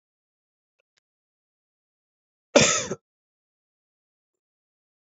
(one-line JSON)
{"cough_length": "5.1 s", "cough_amplitude": 27301, "cough_signal_mean_std_ratio": 0.17, "survey_phase": "alpha (2021-03-01 to 2021-08-12)", "age": "18-44", "gender": "Male", "wearing_mask": "No", "symptom_cough_any": true, "symptom_fatigue": true, "symptom_fever_high_temperature": true, "symptom_headache": true, "symptom_change_to_sense_of_smell_or_taste": true, "symptom_loss_of_taste": true, "symptom_onset": "3 days", "smoker_status": "Current smoker (e-cigarettes or vapes only)", "respiratory_condition_asthma": false, "respiratory_condition_other": false, "recruitment_source": "Test and Trace", "submission_delay": "2 days", "covid_test_result": "Positive", "covid_test_method": "RT-qPCR", "covid_ct_value": 11.9, "covid_ct_gene": "ORF1ab gene", "covid_ct_mean": 12.3, "covid_viral_load": "96000000 copies/ml", "covid_viral_load_category": "High viral load (>1M copies/ml)"}